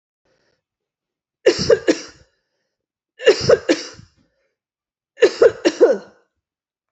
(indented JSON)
{
  "three_cough_length": "6.9 s",
  "three_cough_amplitude": 28594,
  "three_cough_signal_mean_std_ratio": 0.32,
  "survey_phase": "beta (2021-08-13 to 2022-03-07)",
  "age": "45-64",
  "gender": "Female",
  "wearing_mask": "No",
  "symptom_cough_any": true,
  "symptom_runny_or_blocked_nose": true,
  "symptom_fatigue": true,
  "symptom_headache": true,
  "symptom_other": true,
  "symptom_onset": "5 days",
  "smoker_status": "Never smoked",
  "respiratory_condition_asthma": false,
  "respiratory_condition_other": false,
  "recruitment_source": "Test and Trace",
  "submission_delay": "1 day",
  "covid_test_result": "Positive",
  "covid_test_method": "RT-qPCR",
  "covid_ct_value": 22.0,
  "covid_ct_gene": "ORF1ab gene"
}